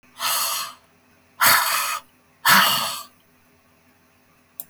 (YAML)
exhalation_length: 4.7 s
exhalation_amplitude: 19680
exhalation_signal_mean_std_ratio: 0.46
survey_phase: beta (2021-08-13 to 2022-03-07)
age: 65+
gender: Female
wearing_mask: 'No'
symptom_none: true
symptom_onset: 13 days
smoker_status: Never smoked
respiratory_condition_asthma: false
respiratory_condition_other: false
recruitment_source: REACT
submission_delay: 2 days
covid_test_result: Negative
covid_test_method: RT-qPCR
influenza_a_test_result: Negative
influenza_b_test_result: Negative